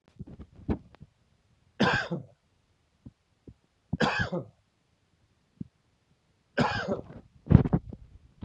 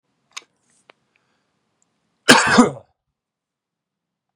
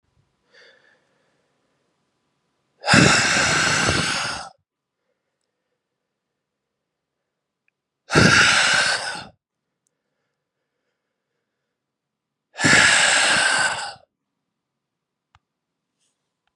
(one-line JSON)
{"three_cough_length": "8.4 s", "three_cough_amplitude": 28262, "three_cough_signal_mean_std_ratio": 0.3, "cough_length": "4.4 s", "cough_amplitude": 32768, "cough_signal_mean_std_ratio": 0.23, "exhalation_length": "16.6 s", "exhalation_amplitude": 31076, "exhalation_signal_mean_std_ratio": 0.38, "survey_phase": "beta (2021-08-13 to 2022-03-07)", "age": "45-64", "gender": "Male", "wearing_mask": "No", "symptom_cough_any": true, "symptom_runny_or_blocked_nose": true, "symptom_fatigue": true, "symptom_headache": true, "symptom_change_to_sense_of_smell_or_taste": true, "symptom_loss_of_taste": true, "symptom_onset": "4 days", "smoker_status": "Current smoker (e-cigarettes or vapes only)", "respiratory_condition_asthma": false, "respiratory_condition_other": false, "recruitment_source": "Test and Trace", "submission_delay": "2 days", "covid_test_result": "Positive", "covid_test_method": "ePCR"}